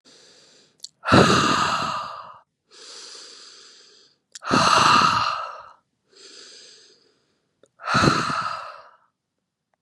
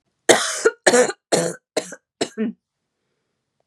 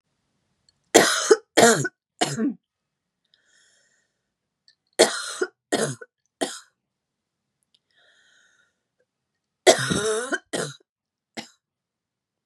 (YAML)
exhalation_length: 9.8 s
exhalation_amplitude: 28893
exhalation_signal_mean_std_ratio: 0.43
cough_length: 3.7 s
cough_amplitude: 32768
cough_signal_mean_std_ratio: 0.39
three_cough_length: 12.5 s
three_cough_amplitude: 32767
three_cough_signal_mean_std_ratio: 0.29
survey_phase: beta (2021-08-13 to 2022-03-07)
age: 18-44
gender: Female
wearing_mask: 'No'
symptom_cough_any: true
symptom_new_continuous_cough: true
symptom_shortness_of_breath: true
symptom_sore_throat: true
symptom_fatigue: true
symptom_change_to_sense_of_smell_or_taste: true
symptom_onset: 3 days
smoker_status: Never smoked
respiratory_condition_asthma: false
respiratory_condition_other: false
recruitment_source: Test and Trace
submission_delay: 2 days
covid_test_result: Positive
covid_test_method: RT-qPCR
covid_ct_value: 25.2
covid_ct_gene: ORF1ab gene
covid_ct_mean: 25.5
covid_viral_load: 4400 copies/ml
covid_viral_load_category: Minimal viral load (< 10K copies/ml)